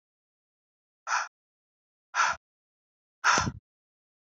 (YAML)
exhalation_length: 4.4 s
exhalation_amplitude: 11351
exhalation_signal_mean_std_ratio: 0.29
survey_phase: beta (2021-08-13 to 2022-03-07)
age: 45-64
gender: Female
wearing_mask: 'No'
symptom_none: true
smoker_status: Never smoked
respiratory_condition_asthma: false
respiratory_condition_other: false
recruitment_source: REACT
submission_delay: 3 days
covid_test_result: Negative
covid_test_method: RT-qPCR
influenza_a_test_result: Negative
influenza_b_test_result: Negative